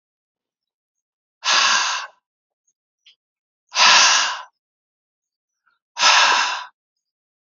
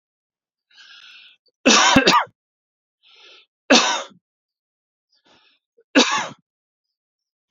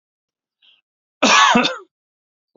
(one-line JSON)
{"exhalation_length": "7.4 s", "exhalation_amplitude": 32756, "exhalation_signal_mean_std_ratio": 0.39, "three_cough_length": "7.5 s", "three_cough_amplitude": 31055, "three_cough_signal_mean_std_ratio": 0.31, "cough_length": "2.6 s", "cough_amplitude": 30280, "cough_signal_mean_std_ratio": 0.36, "survey_phase": "beta (2021-08-13 to 2022-03-07)", "age": "45-64", "gender": "Male", "wearing_mask": "No", "symptom_none": true, "symptom_onset": "3 days", "smoker_status": "Ex-smoker", "respiratory_condition_asthma": false, "respiratory_condition_other": false, "recruitment_source": "REACT", "submission_delay": "1 day", "covid_test_result": "Negative", "covid_test_method": "RT-qPCR", "influenza_a_test_result": "Negative", "influenza_b_test_result": "Negative"}